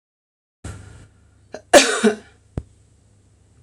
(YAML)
cough_length: 3.6 s
cough_amplitude: 26028
cough_signal_mean_std_ratio: 0.26
survey_phase: alpha (2021-03-01 to 2021-08-12)
age: 45-64
gender: Female
wearing_mask: 'No'
symptom_none: true
smoker_status: Never smoked
respiratory_condition_asthma: false
respiratory_condition_other: false
recruitment_source: REACT
submission_delay: 1 day
covid_test_result: Negative
covid_test_method: RT-qPCR